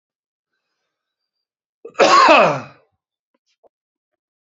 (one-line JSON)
{"cough_length": "4.4 s", "cough_amplitude": 29077, "cough_signal_mean_std_ratio": 0.3, "survey_phase": "beta (2021-08-13 to 2022-03-07)", "age": "45-64", "gender": "Male", "wearing_mask": "No", "symptom_cough_any": true, "symptom_runny_or_blocked_nose": true, "symptom_sore_throat": true, "symptom_fatigue": true, "symptom_other": true, "symptom_onset": "3 days", "smoker_status": "Ex-smoker", "respiratory_condition_asthma": false, "respiratory_condition_other": true, "recruitment_source": "Test and Trace", "submission_delay": "2 days", "covid_test_result": "Positive", "covid_test_method": "RT-qPCR"}